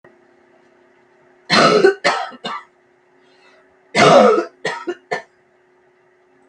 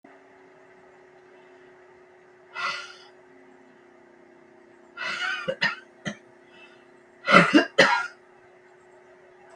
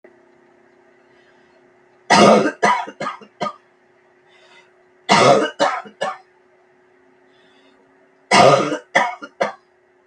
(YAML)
cough_length: 6.5 s
cough_amplitude: 32768
cough_signal_mean_std_ratio: 0.38
exhalation_length: 9.6 s
exhalation_amplitude: 32382
exhalation_signal_mean_std_ratio: 0.3
three_cough_length: 10.1 s
three_cough_amplitude: 32768
three_cough_signal_mean_std_ratio: 0.37
survey_phase: beta (2021-08-13 to 2022-03-07)
age: 65+
gender: Female
wearing_mask: 'No'
symptom_cough_any: true
symptom_runny_or_blocked_nose: true
symptom_fatigue: true
symptom_headache: true
symptom_onset: 9 days
smoker_status: Ex-smoker
respiratory_condition_asthma: false
respiratory_condition_other: false
recruitment_source: REACT
submission_delay: 1 day
covid_test_result: Positive
covid_test_method: RT-qPCR
covid_ct_value: 23.6
covid_ct_gene: E gene
influenza_a_test_result: Negative
influenza_b_test_result: Negative